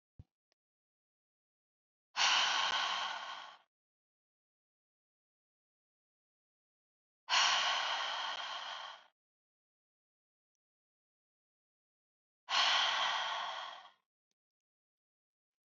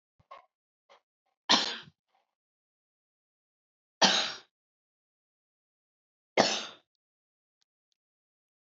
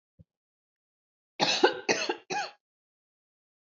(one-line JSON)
{"exhalation_length": "15.8 s", "exhalation_amplitude": 4659, "exhalation_signal_mean_std_ratio": 0.38, "three_cough_length": "8.7 s", "three_cough_amplitude": 16938, "three_cough_signal_mean_std_ratio": 0.22, "cough_length": "3.8 s", "cough_amplitude": 14055, "cough_signal_mean_std_ratio": 0.32, "survey_phase": "beta (2021-08-13 to 2022-03-07)", "age": "18-44", "gender": "Female", "wearing_mask": "No", "symptom_none": true, "smoker_status": "Ex-smoker", "respiratory_condition_asthma": false, "respiratory_condition_other": false, "recruitment_source": "REACT", "submission_delay": "1 day", "covid_test_result": "Negative", "covid_test_method": "RT-qPCR"}